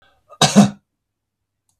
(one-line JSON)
{"cough_length": "1.8 s", "cough_amplitude": 32768, "cough_signal_mean_std_ratio": 0.28, "survey_phase": "beta (2021-08-13 to 2022-03-07)", "age": "45-64", "gender": "Male", "wearing_mask": "No", "symptom_none": true, "smoker_status": "Never smoked", "respiratory_condition_asthma": false, "respiratory_condition_other": false, "recruitment_source": "REACT", "submission_delay": "2 days", "covid_test_result": "Negative", "covid_test_method": "RT-qPCR", "influenza_a_test_result": "Negative", "influenza_b_test_result": "Negative"}